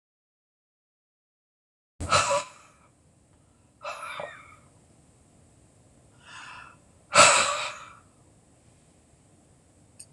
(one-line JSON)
{"exhalation_length": "10.1 s", "exhalation_amplitude": 25757, "exhalation_signal_mean_std_ratio": 0.26, "survey_phase": "alpha (2021-03-01 to 2021-08-12)", "age": "65+", "gender": "Female", "wearing_mask": "No", "symptom_none": true, "smoker_status": "Never smoked", "respiratory_condition_asthma": false, "respiratory_condition_other": false, "recruitment_source": "REACT", "submission_delay": "2 days", "covid_test_result": "Negative", "covid_test_method": "RT-qPCR"}